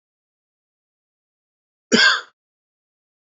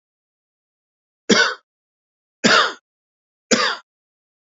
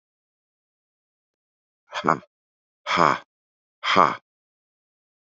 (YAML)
cough_length: 3.2 s
cough_amplitude: 27945
cough_signal_mean_std_ratio: 0.23
three_cough_length: 4.5 s
three_cough_amplitude: 30222
three_cough_signal_mean_std_ratio: 0.31
exhalation_length: 5.3 s
exhalation_amplitude: 27648
exhalation_signal_mean_std_ratio: 0.24
survey_phase: beta (2021-08-13 to 2022-03-07)
age: 45-64
gender: Male
wearing_mask: 'No'
symptom_cough_any: true
symptom_shortness_of_breath: true
symptom_abdominal_pain: true
symptom_fatigue: true
symptom_change_to_sense_of_smell_or_taste: true
symptom_onset: 12 days
smoker_status: Never smoked
respiratory_condition_asthma: false
respiratory_condition_other: false
recruitment_source: REACT
submission_delay: 1 day
covid_test_result: Negative
covid_test_method: RT-qPCR
influenza_a_test_result: Negative
influenza_b_test_result: Negative